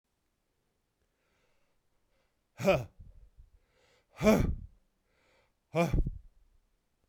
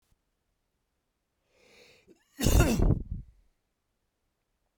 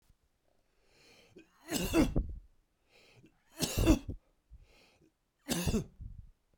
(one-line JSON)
{"exhalation_length": "7.1 s", "exhalation_amplitude": 7468, "exhalation_signal_mean_std_ratio": 0.3, "cough_length": "4.8 s", "cough_amplitude": 11563, "cough_signal_mean_std_ratio": 0.3, "three_cough_length": "6.6 s", "three_cough_amplitude": 7978, "three_cough_signal_mean_std_ratio": 0.36, "survey_phase": "beta (2021-08-13 to 2022-03-07)", "age": "45-64", "gender": "Male", "wearing_mask": "No", "symptom_none": true, "smoker_status": "Never smoked", "respiratory_condition_asthma": false, "respiratory_condition_other": false, "recruitment_source": "REACT", "submission_delay": "2 days", "covid_test_result": "Negative", "covid_test_method": "RT-qPCR"}